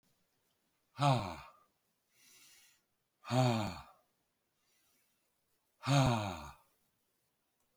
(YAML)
exhalation_length: 7.8 s
exhalation_amplitude: 4503
exhalation_signal_mean_std_ratio: 0.32
survey_phase: beta (2021-08-13 to 2022-03-07)
age: 65+
gender: Male
wearing_mask: 'No'
symptom_none: true
smoker_status: Current smoker (1 to 10 cigarettes per day)
respiratory_condition_asthma: false
respiratory_condition_other: false
recruitment_source: REACT
submission_delay: 1 day
covid_test_result: Negative
covid_test_method: RT-qPCR